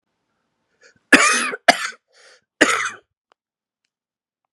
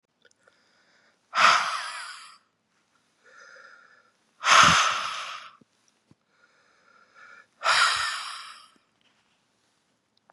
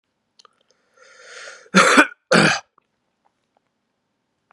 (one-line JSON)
{"three_cough_length": "4.5 s", "three_cough_amplitude": 32768, "three_cough_signal_mean_std_ratio": 0.29, "exhalation_length": "10.3 s", "exhalation_amplitude": 22848, "exhalation_signal_mean_std_ratio": 0.33, "cough_length": "4.5 s", "cough_amplitude": 32276, "cough_signal_mean_std_ratio": 0.29, "survey_phase": "beta (2021-08-13 to 2022-03-07)", "age": "18-44", "gender": "Male", "wearing_mask": "No", "symptom_cough_any": true, "symptom_new_continuous_cough": true, "symptom_sore_throat": true, "symptom_onset": "3 days", "smoker_status": "Never smoked", "respiratory_condition_asthma": false, "respiratory_condition_other": false, "recruitment_source": "Test and Trace", "submission_delay": "2 days", "covid_test_result": "Positive", "covid_test_method": "RT-qPCR", "covid_ct_value": 29.0, "covid_ct_gene": "ORF1ab gene"}